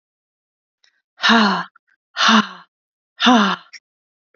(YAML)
exhalation_length: 4.4 s
exhalation_amplitude: 28577
exhalation_signal_mean_std_ratio: 0.4
survey_phase: beta (2021-08-13 to 2022-03-07)
age: 45-64
gender: Female
wearing_mask: 'No'
symptom_runny_or_blocked_nose: true
symptom_other: true
symptom_onset: 1 day
smoker_status: Never smoked
respiratory_condition_asthma: false
respiratory_condition_other: false
recruitment_source: Test and Trace
submission_delay: 0 days
covid_test_result: Negative
covid_test_method: RT-qPCR